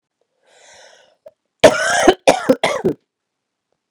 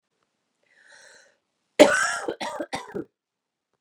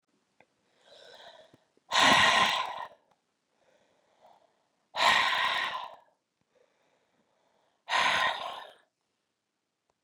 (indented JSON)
{
  "cough_length": "3.9 s",
  "cough_amplitude": 32768,
  "cough_signal_mean_std_ratio": 0.34,
  "three_cough_length": "3.8 s",
  "three_cough_amplitude": 31492,
  "three_cough_signal_mean_std_ratio": 0.27,
  "exhalation_length": "10.0 s",
  "exhalation_amplitude": 10878,
  "exhalation_signal_mean_std_ratio": 0.37,
  "survey_phase": "beta (2021-08-13 to 2022-03-07)",
  "age": "45-64",
  "gender": "Female",
  "wearing_mask": "No",
  "symptom_cough_any": true,
  "symptom_runny_or_blocked_nose": true,
  "symptom_sore_throat": true,
  "symptom_fatigue": true,
  "symptom_headache": true,
  "symptom_change_to_sense_of_smell_or_taste": true,
  "smoker_status": "Never smoked",
  "respiratory_condition_asthma": false,
  "respiratory_condition_other": false,
  "recruitment_source": "Test and Trace",
  "submission_delay": "2 days",
  "covid_test_result": "Positive",
  "covid_test_method": "RT-qPCR",
  "covid_ct_value": 28.5,
  "covid_ct_gene": "N gene",
  "covid_ct_mean": 29.0,
  "covid_viral_load": "310 copies/ml",
  "covid_viral_load_category": "Minimal viral load (< 10K copies/ml)"
}